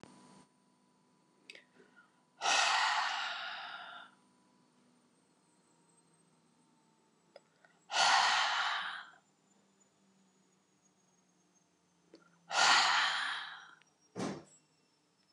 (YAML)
exhalation_length: 15.3 s
exhalation_amplitude: 6463
exhalation_signal_mean_std_ratio: 0.38
survey_phase: beta (2021-08-13 to 2022-03-07)
age: 65+
gender: Female
wearing_mask: 'No'
symptom_none: true
smoker_status: Ex-smoker
respiratory_condition_asthma: false
respiratory_condition_other: false
recruitment_source: REACT
submission_delay: 5 days
covid_test_result: Negative
covid_test_method: RT-qPCR
influenza_a_test_result: Negative
influenza_b_test_result: Negative